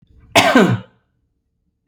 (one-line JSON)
{"cough_length": "1.9 s", "cough_amplitude": 32767, "cough_signal_mean_std_ratio": 0.39, "survey_phase": "beta (2021-08-13 to 2022-03-07)", "age": "45-64", "gender": "Male", "wearing_mask": "No", "symptom_none": true, "smoker_status": "Never smoked", "respiratory_condition_asthma": false, "respiratory_condition_other": false, "recruitment_source": "REACT", "submission_delay": "1 day", "covid_test_result": "Negative", "covid_test_method": "RT-qPCR"}